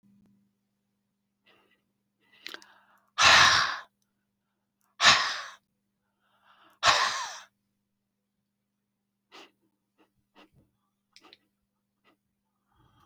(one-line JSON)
{"exhalation_length": "13.1 s", "exhalation_amplitude": 20503, "exhalation_signal_mean_std_ratio": 0.24, "survey_phase": "beta (2021-08-13 to 2022-03-07)", "age": "65+", "gender": "Female", "wearing_mask": "No", "symptom_none": true, "smoker_status": "Never smoked", "respiratory_condition_asthma": false, "respiratory_condition_other": false, "recruitment_source": "REACT", "submission_delay": "1 day", "covid_test_result": "Negative", "covid_test_method": "RT-qPCR"}